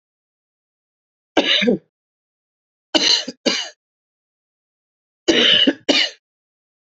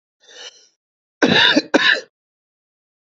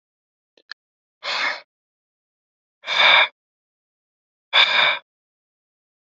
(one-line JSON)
{"three_cough_length": "7.0 s", "three_cough_amplitude": 28206, "three_cough_signal_mean_std_ratio": 0.37, "cough_length": "3.1 s", "cough_amplitude": 32768, "cough_signal_mean_std_ratio": 0.37, "exhalation_length": "6.1 s", "exhalation_amplitude": 30430, "exhalation_signal_mean_std_ratio": 0.32, "survey_phase": "beta (2021-08-13 to 2022-03-07)", "age": "45-64", "gender": "Male", "wearing_mask": "No", "symptom_cough_any": true, "symptom_runny_or_blocked_nose": true, "symptom_sore_throat": true, "symptom_fatigue": true, "symptom_fever_high_temperature": true, "symptom_headache": true, "symptom_other": true, "smoker_status": "Ex-smoker", "respiratory_condition_asthma": true, "respiratory_condition_other": false, "recruitment_source": "Test and Trace", "submission_delay": "1 day", "covid_test_result": "Positive", "covid_test_method": "RT-qPCR", "covid_ct_value": 20.8, "covid_ct_gene": "ORF1ab gene"}